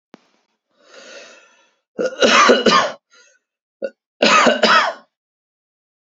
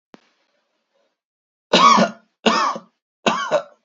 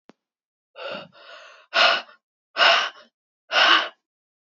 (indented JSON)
{
  "cough_length": "6.1 s",
  "cough_amplitude": 32768,
  "cough_signal_mean_std_ratio": 0.41,
  "three_cough_length": "3.8 s",
  "three_cough_amplitude": 28552,
  "three_cough_signal_mean_std_ratio": 0.4,
  "exhalation_length": "4.4 s",
  "exhalation_amplitude": 24165,
  "exhalation_signal_mean_std_ratio": 0.39,
  "survey_phase": "beta (2021-08-13 to 2022-03-07)",
  "age": "18-44",
  "gender": "Male",
  "wearing_mask": "No",
  "symptom_none": true,
  "smoker_status": "Current smoker (e-cigarettes or vapes only)",
  "respiratory_condition_asthma": true,
  "respiratory_condition_other": false,
  "recruitment_source": "REACT",
  "submission_delay": "4 days",
  "covid_test_result": "Negative",
  "covid_test_method": "RT-qPCR",
  "influenza_a_test_result": "Negative",
  "influenza_b_test_result": "Negative"
}